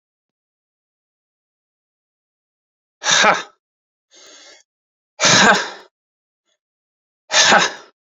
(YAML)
exhalation_length: 8.2 s
exhalation_amplitude: 32767
exhalation_signal_mean_std_ratio: 0.31
survey_phase: beta (2021-08-13 to 2022-03-07)
age: 45-64
gender: Male
wearing_mask: 'No'
symptom_none: true
symptom_onset: 6 days
smoker_status: Ex-smoker
respiratory_condition_asthma: false
respiratory_condition_other: false
recruitment_source: REACT
submission_delay: 1 day
covid_test_result: Negative
covid_test_method: RT-qPCR